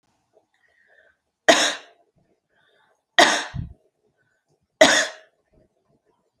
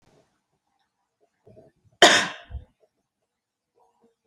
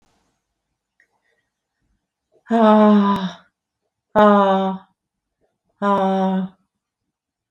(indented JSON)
{
  "three_cough_length": "6.4 s",
  "three_cough_amplitude": 32768,
  "three_cough_signal_mean_std_ratio": 0.26,
  "cough_length": "4.3 s",
  "cough_amplitude": 29951,
  "cough_signal_mean_std_ratio": 0.19,
  "exhalation_length": "7.5 s",
  "exhalation_amplitude": 26704,
  "exhalation_signal_mean_std_ratio": 0.42,
  "survey_phase": "alpha (2021-03-01 to 2021-08-12)",
  "age": "45-64",
  "gender": "Female",
  "wearing_mask": "No",
  "symptom_none": true,
  "smoker_status": "Current smoker (1 to 10 cigarettes per day)",
  "respiratory_condition_asthma": false,
  "respiratory_condition_other": false,
  "recruitment_source": "REACT",
  "submission_delay": "1 day",
  "covid_test_result": "Negative",
  "covid_test_method": "RT-qPCR"
}